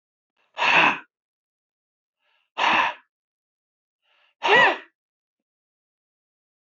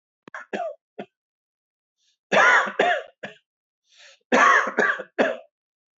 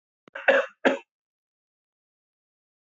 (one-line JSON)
{"exhalation_length": "6.7 s", "exhalation_amplitude": 19231, "exhalation_signal_mean_std_ratio": 0.31, "three_cough_length": "6.0 s", "three_cough_amplitude": 19931, "three_cough_signal_mean_std_ratio": 0.41, "cough_length": "2.8 s", "cough_amplitude": 18309, "cough_signal_mean_std_ratio": 0.25, "survey_phase": "beta (2021-08-13 to 2022-03-07)", "age": "45-64", "gender": "Male", "wearing_mask": "No", "symptom_none": true, "smoker_status": "Never smoked", "respiratory_condition_asthma": false, "respiratory_condition_other": false, "recruitment_source": "REACT", "submission_delay": "2 days", "covid_test_result": "Negative", "covid_test_method": "RT-qPCR"}